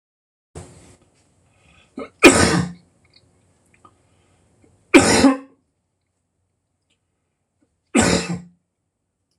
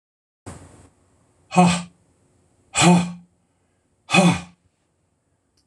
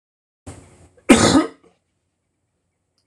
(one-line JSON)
{"three_cough_length": "9.4 s", "three_cough_amplitude": 26028, "three_cough_signal_mean_std_ratio": 0.28, "exhalation_length": "5.7 s", "exhalation_amplitude": 24392, "exhalation_signal_mean_std_ratio": 0.32, "cough_length": "3.1 s", "cough_amplitude": 26028, "cough_signal_mean_std_ratio": 0.27, "survey_phase": "beta (2021-08-13 to 2022-03-07)", "age": "65+", "gender": "Male", "wearing_mask": "No", "symptom_none": true, "smoker_status": "Never smoked", "respiratory_condition_asthma": false, "respiratory_condition_other": false, "recruitment_source": "REACT", "submission_delay": "1 day", "covid_test_result": "Negative", "covid_test_method": "RT-qPCR"}